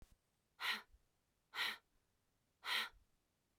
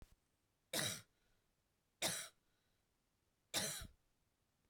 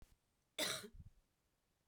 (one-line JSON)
{"exhalation_length": "3.6 s", "exhalation_amplitude": 1326, "exhalation_signal_mean_std_ratio": 0.35, "three_cough_length": "4.7 s", "three_cough_amplitude": 1963, "three_cough_signal_mean_std_ratio": 0.34, "cough_length": "1.9 s", "cough_amplitude": 1383, "cough_signal_mean_std_ratio": 0.35, "survey_phase": "beta (2021-08-13 to 2022-03-07)", "age": "18-44", "gender": "Female", "wearing_mask": "No", "symptom_sore_throat": true, "smoker_status": "Ex-smoker", "respiratory_condition_asthma": false, "respiratory_condition_other": false, "recruitment_source": "REACT", "submission_delay": "1 day", "covid_test_result": "Negative", "covid_test_method": "RT-qPCR", "influenza_a_test_result": "Negative", "influenza_b_test_result": "Negative"}